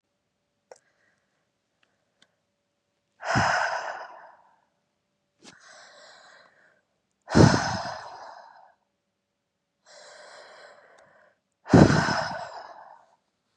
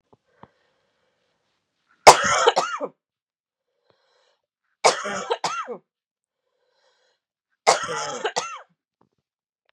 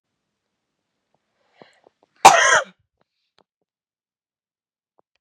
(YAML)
exhalation_length: 13.6 s
exhalation_amplitude: 28289
exhalation_signal_mean_std_ratio: 0.27
three_cough_length: 9.7 s
three_cough_amplitude: 32768
three_cough_signal_mean_std_ratio: 0.26
cough_length: 5.2 s
cough_amplitude: 32768
cough_signal_mean_std_ratio: 0.19
survey_phase: beta (2021-08-13 to 2022-03-07)
age: 18-44
gender: Female
wearing_mask: 'No'
symptom_runny_or_blocked_nose: true
symptom_sore_throat: true
symptom_fatigue: true
symptom_fever_high_temperature: true
symptom_headache: true
symptom_other: true
symptom_onset: 3 days
smoker_status: Ex-smoker
respiratory_condition_asthma: false
respiratory_condition_other: false
recruitment_source: Test and Trace
submission_delay: 1 day
covid_test_result: Positive
covid_test_method: RT-qPCR
covid_ct_value: 16.4
covid_ct_gene: ORF1ab gene
covid_ct_mean: 16.8
covid_viral_load: 3100000 copies/ml
covid_viral_load_category: High viral load (>1M copies/ml)